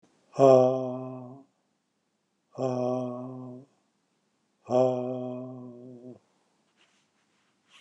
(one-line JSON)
{"exhalation_length": "7.8 s", "exhalation_amplitude": 16112, "exhalation_signal_mean_std_ratio": 0.35, "survey_phase": "beta (2021-08-13 to 2022-03-07)", "age": "45-64", "gender": "Male", "wearing_mask": "No", "symptom_other": true, "symptom_onset": "5 days", "smoker_status": "Never smoked", "respiratory_condition_asthma": false, "respiratory_condition_other": false, "recruitment_source": "REACT", "submission_delay": "3 days", "covid_test_result": "Negative", "covid_test_method": "RT-qPCR", "influenza_a_test_result": "Negative", "influenza_b_test_result": "Negative"}